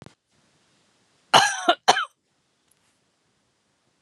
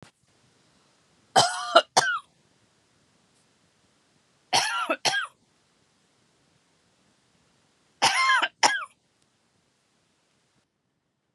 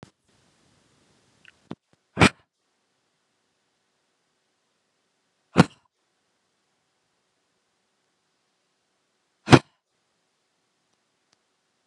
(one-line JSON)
{"cough_length": "4.0 s", "cough_amplitude": 30617, "cough_signal_mean_std_ratio": 0.24, "three_cough_length": "11.3 s", "three_cough_amplitude": 30965, "three_cough_signal_mean_std_ratio": 0.3, "exhalation_length": "11.9 s", "exhalation_amplitude": 32768, "exhalation_signal_mean_std_ratio": 0.11, "survey_phase": "beta (2021-08-13 to 2022-03-07)", "age": "45-64", "gender": "Female", "wearing_mask": "No", "symptom_none": true, "smoker_status": "Ex-smoker", "respiratory_condition_asthma": false, "respiratory_condition_other": false, "recruitment_source": "REACT", "submission_delay": "2 days", "covid_test_result": "Negative", "covid_test_method": "RT-qPCR", "influenza_a_test_result": "Negative", "influenza_b_test_result": "Negative"}